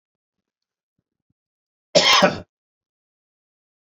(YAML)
cough_length: 3.8 s
cough_amplitude: 28150
cough_signal_mean_std_ratio: 0.25
survey_phase: beta (2021-08-13 to 2022-03-07)
age: 65+
gender: Male
wearing_mask: 'No'
symptom_none: true
smoker_status: Ex-smoker
respiratory_condition_asthma: false
respiratory_condition_other: false
recruitment_source: REACT
submission_delay: 2 days
covid_test_result: Negative
covid_test_method: RT-qPCR
influenza_a_test_result: Negative
influenza_b_test_result: Negative